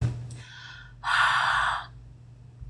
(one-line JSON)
{"exhalation_length": "2.7 s", "exhalation_amplitude": 11077, "exhalation_signal_mean_std_ratio": 0.63, "survey_phase": "beta (2021-08-13 to 2022-03-07)", "age": "45-64", "gender": "Female", "wearing_mask": "No", "symptom_none": true, "smoker_status": "Never smoked", "respiratory_condition_asthma": false, "respiratory_condition_other": false, "recruitment_source": "REACT", "submission_delay": "4 days", "covid_test_result": "Negative", "covid_test_method": "RT-qPCR"}